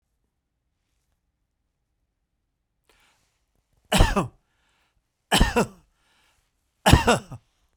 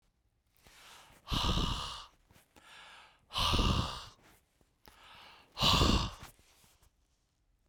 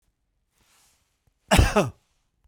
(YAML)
three_cough_length: 7.8 s
three_cough_amplitude: 32767
three_cough_signal_mean_std_ratio: 0.25
exhalation_length: 7.7 s
exhalation_amplitude: 7879
exhalation_signal_mean_std_ratio: 0.41
cough_length: 2.5 s
cough_amplitude: 20361
cough_signal_mean_std_ratio: 0.28
survey_phase: beta (2021-08-13 to 2022-03-07)
age: 45-64
gender: Male
wearing_mask: 'Yes'
symptom_headache: true
smoker_status: Never smoked
respiratory_condition_asthma: false
respiratory_condition_other: false
recruitment_source: REACT
submission_delay: 7 days
covid_test_result: Negative
covid_test_method: RT-qPCR
influenza_a_test_result: Unknown/Void
influenza_b_test_result: Unknown/Void